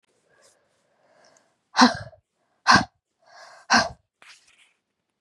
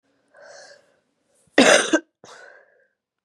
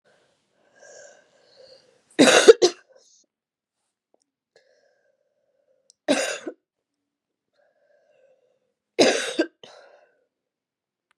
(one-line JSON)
{"exhalation_length": "5.2 s", "exhalation_amplitude": 31953, "exhalation_signal_mean_std_ratio": 0.24, "cough_length": "3.2 s", "cough_amplitude": 32584, "cough_signal_mean_std_ratio": 0.27, "three_cough_length": "11.2 s", "three_cough_amplitude": 32768, "three_cough_signal_mean_std_ratio": 0.21, "survey_phase": "beta (2021-08-13 to 2022-03-07)", "age": "18-44", "gender": "Female", "wearing_mask": "No", "symptom_cough_any": true, "symptom_runny_or_blocked_nose": true, "symptom_headache": true, "symptom_change_to_sense_of_smell_or_taste": true, "symptom_loss_of_taste": true, "symptom_onset": "2 days", "smoker_status": "Ex-smoker", "respiratory_condition_asthma": false, "respiratory_condition_other": false, "recruitment_source": "Test and Trace", "submission_delay": "1 day", "covid_test_result": "Negative", "covid_test_method": "ePCR"}